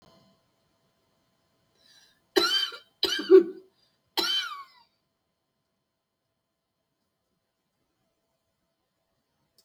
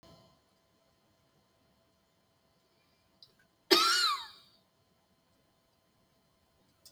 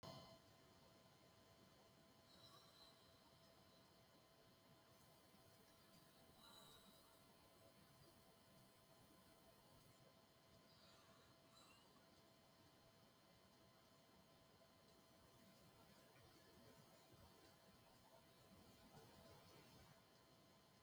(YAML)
three_cough_length: 9.6 s
three_cough_amplitude: 16818
three_cough_signal_mean_std_ratio: 0.22
cough_length: 6.9 s
cough_amplitude: 12353
cough_signal_mean_std_ratio: 0.23
exhalation_length: 20.8 s
exhalation_amplitude: 155
exhalation_signal_mean_std_ratio: 1.08
survey_phase: beta (2021-08-13 to 2022-03-07)
age: 65+
gender: Female
wearing_mask: 'No'
symptom_shortness_of_breath: true
symptom_diarrhoea: true
smoker_status: Ex-smoker
respiratory_condition_asthma: false
respiratory_condition_other: true
recruitment_source: REACT
submission_delay: 2 days
covid_test_result: Negative
covid_test_method: RT-qPCR